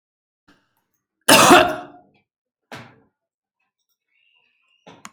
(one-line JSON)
{"cough_length": "5.1 s", "cough_amplitude": 32768, "cough_signal_mean_std_ratio": 0.24, "survey_phase": "alpha (2021-03-01 to 2021-08-12)", "age": "45-64", "gender": "Female", "wearing_mask": "No", "symptom_none": true, "smoker_status": "Ex-smoker", "respiratory_condition_asthma": false, "respiratory_condition_other": false, "recruitment_source": "REACT", "submission_delay": "3 days", "covid_test_result": "Negative", "covid_test_method": "RT-qPCR"}